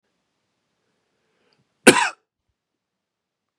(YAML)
cough_length: 3.6 s
cough_amplitude: 32768
cough_signal_mean_std_ratio: 0.16
survey_phase: beta (2021-08-13 to 2022-03-07)
age: 18-44
gender: Male
wearing_mask: 'No'
symptom_none: true
symptom_onset: 6 days
smoker_status: Prefer not to say
respiratory_condition_asthma: false
respiratory_condition_other: false
recruitment_source: REACT
submission_delay: 16 days
covid_test_result: Negative
covid_test_method: RT-qPCR
influenza_a_test_result: Unknown/Void
influenza_b_test_result: Unknown/Void